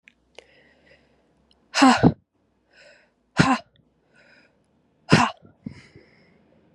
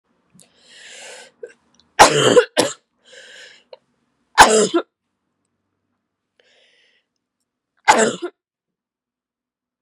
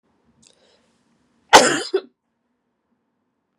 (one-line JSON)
{"exhalation_length": "6.7 s", "exhalation_amplitude": 31247, "exhalation_signal_mean_std_ratio": 0.26, "three_cough_length": "9.8 s", "three_cough_amplitude": 32768, "three_cough_signal_mean_std_ratio": 0.26, "cough_length": "3.6 s", "cough_amplitude": 32768, "cough_signal_mean_std_ratio": 0.21, "survey_phase": "beta (2021-08-13 to 2022-03-07)", "age": "18-44", "gender": "Female", "wearing_mask": "No", "symptom_cough_any": true, "symptom_shortness_of_breath": true, "symptom_abdominal_pain": true, "symptom_change_to_sense_of_smell_or_taste": true, "symptom_onset": "5 days", "smoker_status": "Never smoked", "respiratory_condition_asthma": false, "respiratory_condition_other": false, "recruitment_source": "Test and Trace", "submission_delay": "1 day", "covid_test_result": "Positive", "covid_test_method": "RT-qPCR", "covid_ct_value": 31.0, "covid_ct_gene": "N gene"}